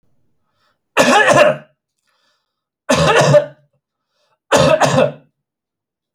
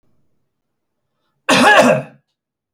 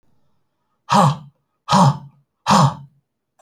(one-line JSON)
{"three_cough_length": "6.1 s", "three_cough_amplitude": 32637, "three_cough_signal_mean_std_ratio": 0.45, "cough_length": "2.7 s", "cough_amplitude": 32246, "cough_signal_mean_std_ratio": 0.37, "exhalation_length": "3.4 s", "exhalation_amplitude": 26783, "exhalation_signal_mean_std_ratio": 0.41, "survey_phase": "alpha (2021-03-01 to 2021-08-12)", "age": "45-64", "gender": "Male", "wearing_mask": "No", "symptom_none": true, "smoker_status": "Never smoked", "respiratory_condition_asthma": false, "respiratory_condition_other": false, "recruitment_source": "Test and Trace", "submission_delay": "3 days", "covid_test_result": "Negative", "covid_test_method": "LFT"}